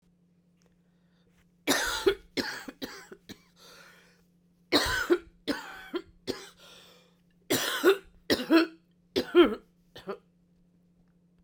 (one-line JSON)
{"three_cough_length": "11.4 s", "three_cough_amplitude": 12822, "three_cough_signal_mean_std_ratio": 0.35, "survey_phase": "beta (2021-08-13 to 2022-03-07)", "age": "45-64", "gender": "Female", "wearing_mask": "No", "symptom_cough_any": true, "symptom_sore_throat": true, "symptom_headache": true, "symptom_onset": "4 days", "smoker_status": "Never smoked", "respiratory_condition_asthma": false, "respiratory_condition_other": false, "recruitment_source": "Test and Trace", "submission_delay": "1 day", "covid_test_result": "Positive", "covid_test_method": "RT-qPCR"}